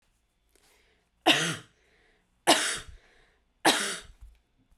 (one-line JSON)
{"three_cough_length": "4.8 s", "three_cough_amplitude": 18115, "three_cough_signal_mean_std_ratio": 0.32, "survey_phase": "beta (2021-08-13 to 2022-03-07)", "age": "18-44", "gender": "Female", "wearing_mask": "No", "symptom_none": true, "symptom_onset": "13 days", "smoker_status": "Never smoked", "respiratory_condition_asthma": false, "respiratory_condition_other": false, "recruitment_source": "REACT", "submission_delay": "0 days", "covid_test_result": "Negative", "covid_test_method": "RT-qPCR"}